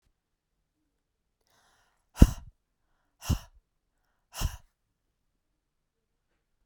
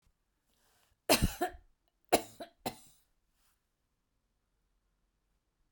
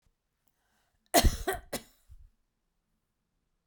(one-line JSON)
{"exhalation_length": "6.7 s", "exhalation_amplitude": 30125, "exhalation_signal_mean_std_ratio": 0.13, "three_cough_length": "5.7 s", "three_cough_amplitude": 8827, "three_cough_signal_mean_std_ratio": 0.21, "cough_length": "3.7 s", "cough_amplitude": 15950, "cough_signal_mean_std_ratio": 0.23, "survey_phase": "beta (2021-08-13 to 2022-03-07)", "age": "45-64", "gender": "Female", "wearing_mask": "No", "symptom_none": true, "smoker_status": "Never smoked", "respiratory_condition_asthma": false, "respiratory_condition_other": false, "recruitment_source": "REACT", "submission_delay": "2 days", "covid_test_result": "Negative", "covid_test_method": "RT-qPCR"}